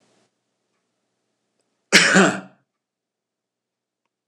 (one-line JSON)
{"cough_length": "4.3 s", "cough_amplitude": 26028, "cough_signal_mean_std_ratio": 0.25, "survey_phase": "beta (2021-08-13 to 2022-03-07)", "age": "65+", "gender": "Male", "wearing_mask": "No", "symptom_none": true, "smoker_status": "Ex-smoker", "respiratory_condition_asthma": false, "respiratory_condition_other": false, "recruitment_source": "REACT", "submission_delay": "0 days", "covid_test_result": "Negative", "covid_test_method": "RT-qPCR", "influenza_a_test_result": "Unknown/Void", "influenza_b_test_result": "Unknown/Void"}